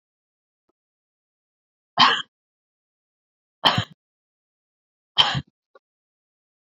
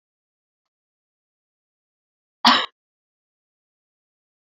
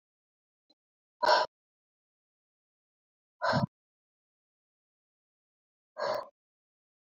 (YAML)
three_cough_length: 6.7 s
three_cough_amplitude: 28696
three_cough_signal_mean_std_ratio: 0.22
cough_length: 4.4 s
cough_amplitude: 32539
cough_signal_mean_std_ratio: 0.16
exhalation_length: 7.1 s
exhalation_amplitude: 7716
exhalation_signal_mean_std_ratio: 0.23
survey_phase: beta (2021-08-13 to 2022-03-07)
age: 18-44
gender: Female
wearing_mask: 'No'
symptom_runny_or_blocked_nose: true
symptom_shortness_of_breath: true
symptom_sore_throat: true
symptom_fatigue: true
symptom_change_to_sense_of_smell_or_taste: true
symptom_loss_of_taste: true
symptom_other: true
smoker_status: Ex-smoker
respiratory_condition_asthma: true
respiratory_condition_other: true
recruitment_source: Test and Trace
submission_delay: 1 day
covid_test_result: Positive
covid_test_method: RT-qPCR
covid_ct_value: 18.6
covid_ct_gene: ORF1ab gene
covid_ct_mean: 19.1
covid_viral_load: 540000 copies/ml
covid_viral_load_category: Low viral load (10K-1M copies/ml)